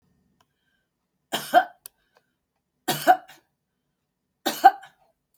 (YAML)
three_cough_length: 5.4 s
three_cough_amplitude: 29792
three_cough_signal_mean_std_ratio: 0.22
survey_phase: beta (2021-08-13 to 2022-03-07)
age: 65+
gender: Female
wearing_mask: 'No'
symptom_none: true
smoker_status: Ex-smoker
respiratory_condition_asthma: false
respiratory_condition_other: false
recruitment_source: REACT
submission_delay: 1 day
covid_test_result: Negative
covid_test_method: RT-qPCR
influenza_a_test_result: Negative
influenza_b_test_result: Negative